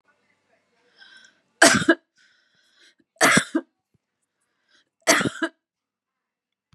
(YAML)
three_cough_length: 6.7 s
three_cough_amplitude: 32767
three_cough_signal_mean_std_ratio: 0.27
survey_phase: beta (2021-08-13 to 2022-03-07)
age: 45-64
gender: Female
wearing_mask: 'No'
symptom_runny_or_blocked_nose: true
symptom_change_to_sense_of_smell_or_taste: true
symptom_loss_of_taste: true
smoker_status: Ex-smoker
respiratory_condition_asthma: false
respiratory_condition_other: false
recruitment_source: Test and Trace
submission_delay: 2 days
covid_test_result: Positive
covid_test_method: RT-qPCR
covid_ct_value: 16.8
covid_ct_gene: ORF1ab gene
covid_ct_mean: 17.9
covid_viral_load: 1300000 copies/ml
covid_viral_load_category: High viral load (>1M copies/ml)